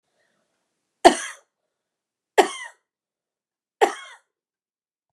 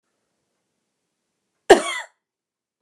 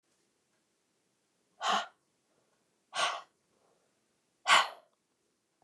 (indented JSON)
{
  "three_cough_length": "5.1 s",
  "three_cough_amplitude": 29204,
  "three_cough_signal_mean_std_ratio": 0.18,
  "cough_length": "2.8 s",
  "cough_amplitude": 29204,
  "cough_signal_mean_std_ratio": 0.17,
  "exhalation_length": "5.6 s",
  "exhalation_amplitude": 9963,
  "exhalation_signal_mean_std_ratio": 0.25,
  "survey_phase": "beta (2021-08-13 to 2022-03-07)",
  "age": "45-64",
  "gender": "Female",
  "wearing_mask": "No",
  "symptom_fatigue": true,
  "smoker_status": "Never smoked",
  "respiratory_condition_asthma": true,
  "respiratory_condition_other": false,
  "recruitment_source": "REACT",
  "submission_delay": "1 day",
  "covid_test_result": "Negative",
  "covid_test_method": "RT-qPCR"
}